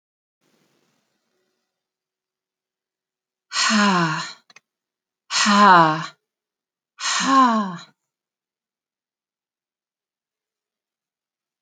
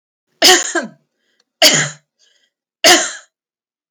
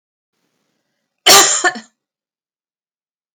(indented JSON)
{
  "exhalation_length": "11.6 s",
  "exhalation_amplitude": 28882,
  "exhalation_signal_mean_std_ratio": 0.32,
  "three_cough_length": "3.9 s",
  "three_cough_amplitude": 32768,
  "three_cough_signal_mean_std_ratio": 0.37,
  "cough_length": "3.3 s",
  "cough_amplitude": 32768,
  "cough_signal_mean_std_ratio": 0.28,
  "survey_phase": "alpha (2021-03-01 to 2021-08-12)",
  "age": "45-64",
  "gender": "Female",
  "wearing_mask": "No",
  "symptom_none": true,
  "smoker_status": "Never smoked",
  "respiratory_condition_asthma": false,
  "respiratory_condition_other": false,
  "recruitment_source": "REACT",
  "submission_delay": "1 day",
  "covid_test_result": "Negative",
  "covid_test_method": "RT-qPCR"
}